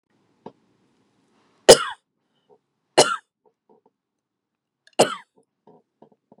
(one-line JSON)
{"three_cough_length": "6.4 s", "three_cough_amplitude": 32768, "three_cough_signal_mean_std_ratio": 0.16, "survey_phase": "beta (2021-08-13 to 2022-03-07)", "age": "18-44", "gender": "Female", "wearing_mask": "No", "symptom_runny_or_blocked_nose": true, "symptom_sore_throat": true, "symptom_diarrhoea": true, "symptom_headache": true, "smoker_status": "Ex-smoker", "respiratory_condition_asthma": false, "respiratory_condition_other": false, "recruitment_source": "REACT", "submission_delay": "1 day", "covid_test_result": "Negative", "covid_test_method": "RT-qPCR", "influenza_a_test_result": "Unknown/Void", "influenza_b_test_result": "Unknown/Void"}